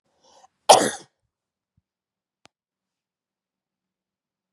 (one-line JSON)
{"cough_length": "4.5 s", "cough_amplitude": 32767, "cough_signal_mean_std_ratio": 0.15, "survey_phase": "beta (2021-08-13 to 2022-03-07)", "age": "45-64", "gender": "Female", "wearing_mask": "No", "symptom_none": true, "smoker_status": "Ex-smoker", "respiratory_condition_asthma": false, "respiratory_condition_other": false, "recruitment_source": "REACT", "submission_delay": "1 day", "covid_test_result": "Negative", "covid_test_method": "RT-qPCR", "influenza_a_test_result": "Negative", "influenza_b_test_result": "Negative"}